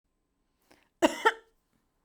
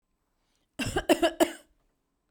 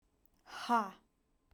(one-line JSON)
{"cough_length": "2.0 s", "cough_amplitude": 14877, "cough_signal_mean_std_ratio": 0.21, "three_cough_length": "2.3 s", "three_cough_amplitude": 13239, "three_cough_signal_mean_std_ratio": 0.32, "exhalation_length": "1.5 s", "exhalation_amplitude": 3376, "exhalation_signal_mean_std_ratio": 0.33, "survey_phase": "beta (2021-08-13 to 2022-03-07)", "age": "18-44", "gender": "Female", "wearing_mask": "No", "symptom_none": true, "smoker_status": "Ex-smoker", "respiratory_condition_asthma": false, "respiratory_condition_other": false, "recruitment_source": "REACT", "submission_delay": "0 days", "covid_test_result": "Negative", "covid_test_method": "RT-qPCR"}